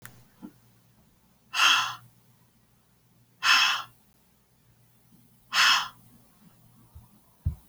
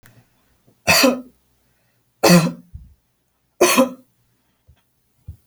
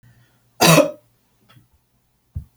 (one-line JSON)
{"exhalation_length": "7.7 s", "exhalation_amplitude": 14773, "exhalation_signal_mean_std_ratio": 0.33, "three_cough_length": "5.5 s", "three_cough_amplitude": 32767, "three_cough_signal_mean_std_ratio": 0.32, "cough_length": "2.6 s", "cough_amplitude": 32631, "cough_signal_mean_std_ratio": 0.28, "survey_phase": "beta (2021-08-13 to 2022-03-07)", "age": "45-64", "gender": "Female", "wearing_mask": "No", "symptom_none": true, "smoker_status": "Never smoked", "respiratory_condition_asthma": false, "respiratory_condition_other": false, "recruitment_source": "REACT", "submission_delay": "2 days", "covid_test_result": "Negative", "covid_test_method": "RT-qPCR"}